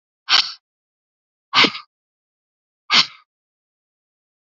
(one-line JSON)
{"exhalation_length": "4.4 s", "exhalation_amplitude": 32768, "exhalation_signal_mean_std_ratio": 0.25, "survey_phase": "alpha (2021-03-01 to 2021-08-12)", "age": "45-64", "gender": "Female", "wearing_mask": "No", "symptom_none": true, "smoker_status": "Never smoked", "respiratory_condition_asthma": false, "respiratory_condition_other": false, "recruitment_source": "REACT", "submission_delay": "2 days", "covid_test_result": "Negative", "covid_test_method": "RT-qPCR"}